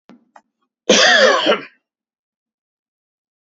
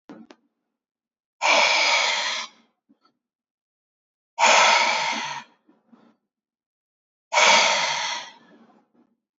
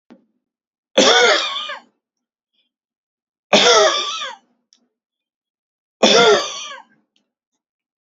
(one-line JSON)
{"cough_length": "3.5 s", "cough_amplitude": 30987, "cough_signal_mean_std_ratio": 0.37, "exhalation_length": "9.4 s", "exhalation_amplitude": 24004, "exhalation_signal_mean_std_ratio": 0.44, "three_cough_length": "8.0 s", "three_cough_amplitude": 31949, "three_cough_signal_mean_std_ratio": 0.38, "survey_phase": "beta (2021-08-13 to 2022-03-07)", "age": "18-44", "gender": "Male", "wearing_mask": "No", "symptom_diarrhoea": true, "smoker_status": "Never smoked", "respiratory_condition_asthma": false, "respiratory_condition_other": false, "recruitment_source": "REACT", "submission_delay": "1 day", "covid_test_result": "Negative", "covid_test_method": "RT-qPCR", "influenza_a_test_result": "Negative", "influenza_b_test_result": "Negative"}